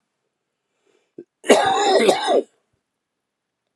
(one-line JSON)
{"cough_length": "3.8 s", "cough_amplitude": 32437, "cough_signal_mean_std_ratio": 0.4, "survey_phase": "beta (2021-08-13 to 2022-03-07)", "age": "45-64", "gender": "Male", "wearing_mask": "No", "symptom_cough_any": true, "symptom_runny_or_blocked_nose": true, "symptom_sore_throat": true, "symptom_fatigue": true, "symptom_onset": "3 days", "smoker_status": "Never smoked", "respiratory_condition_asthma": false, "respiratory_condition_other": true, "recruitment_source": "Test and Trace", "submission_delay": "2 days", "covid_test_result": "Positive", "covid_test_method": "RT-qPCR", "covid_ct_value": 23.1, "covid_ct_gene": "ORF1ab gene", "covid_ct_mean": 24.5, "covid_viral_load": "8900 copies/ml", "covid_viral_load_category": "Minimal viral load (< 10K copies/ml)"}